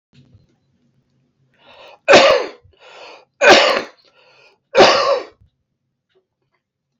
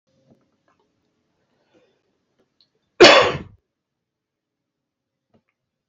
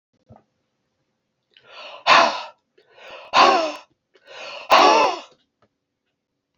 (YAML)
three_cough_length: 7.0 s
three_cough_amplitude: 32767
three_cough_signal_mean_std_ratio: 0.34
cough_length: 5.9 s
cough_amplitude: 32768
cough_signal_mean_std_ratio: 0.18
exhalation_length: 6.6 s
exhalation_amplitude: 27621
exhalation_signal_mean_std_ratio: 0.35
survey_phase: beta (2021-08-13 to 2022-03-07)
age: 45-64
gender: Male
wearing_mask: 'No'
symptom_cough_any: true
symptom_runny_or_blocked_nose: true
symptom_onset: 3 days
smoker_status: Never smoked
respiratory_condition_asthma: false
respiratory_condition_other: false
recruitment_source: Test and Trace
submission_delay: 2 days
covid_test_result: Positive
covid_test_method: RT-qPCR